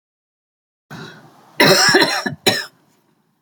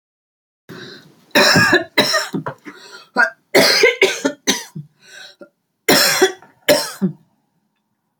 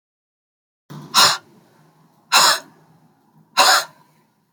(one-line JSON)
{"cough_length": "3.4 s", "cough_amplitude": 31938, "cough_signal_mean_std_ratio": 0.41, "three_cough_length": "8.2 s", "three_cough_amplitude": 32767, "three_cough_signal_mean_std_ratio": 0.46, "exhalation_length": "4.5 s", "exhalation_amplitude": 30764, "exhalation_signal_mean_std_ratio": 0.34, "survey_phase": "beta (2021-08-13 to 2022-03-07)", "age": "65+", "gender": "Female", "wearing_mask": "No", "symptom_none": true, "smoker_status": "Never smoked", "respiratory_condition_asthma": false, "respiratory_condition_other": true, "recruitment_source": "REACT", "submission_delay": "2 days", "covid_test_result": "Negative", "covid_test_method": "RT-qPCR", "influenza_a_test_result": "Negative", "influenza_b_test_result": "Negative"}